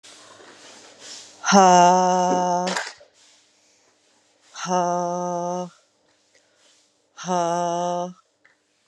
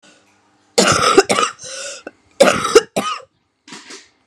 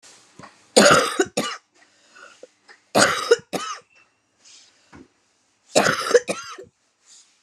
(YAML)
exhalation_length: 8.9 s
exhalation_amplitude: 31903
exhalation_signal_mean_std_ratio: 0.43
cough_length: 4.3 s
cough_amplitude: 32768
cough_signal_mean_std_ratio: 0.42
three_cough_length: 7.4 s
three_cough_amplitude: 31806
three_cough_signal_mean_std_ratio: 0.34
survey_phase: beta (2021-08-13 to 2022-03-07)
age: 45-64
gender: Female
wearing_mask: 'No'
symptom_cough_any: true
symptom_runny_or_blocked_nose: true
symptom_shortness_of_breath: true
symptom_sore_throat: true
symptom_abdominal_pain: true
symptom_fatigue: true
symptom_fever_high_temperature: true
symptom_headache: true
symptom_change_to_sense_of_smell_or_taste: true
symptom_onset: 23 days
smoker_status: Current smoker (1 to 10 cigarettes per day)
respiratory_condition_asthma: false
respiratory_condition_other: false
recruitment_source: Test and Trace
submission_delay: 22 days
covid_test_result: Negative
covid_test_method: RT-qPCR